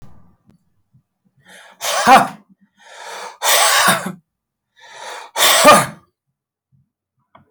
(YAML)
exhalation_length: 7.5 s
exhalation_amplitude: 32768
exhalation_signal_mean_std_ratio: 0.38
survey_phase: alpha (2021-03-01 to 2021-08-12)
age: 65+
gender: Male
wearing_mask: 'No'
symptom_none: true
smoker_status: Ex-smoker
respiratory_condition_asthma: false
respiratory_condition_other: false
recruitment_source: REACT
submission_delay: 1 day
covid_test_result: Negative
covid_test_method: RT-qPCR